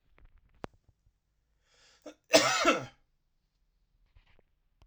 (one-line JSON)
{"cough_length": "4.9 s", "cough_amplitude": 16127, "cough_signal_mean_std_ratio": 0.24, "survey_phase": "alpha (2021-03-01 to 2021-08-12)", "age": "18-44", "gender": "Male", "wearing_mask": "No", "symptom_cough_any": true, "symptom_shortness_of_breath": true, "symptom_onset": "8 days", "smoker_status": "Ex-smoker", "respiratory_condition_asthma": true, "respiratory_condition_other": false, "recruitment_source": "Test and Trace", "submission_delay": "1 day", "covid_test_result": "Positive", "covid_test_method": "RT-qPCR", "covid_ct_value": 17.2, "covid_ct_gene": "ORF1ab gene", "covid_ct_mean": 17.3, "covid_viral_load": "2100000 copies/ml", "covid_viral_load_category": "High viral load (>1M copies/ml)"}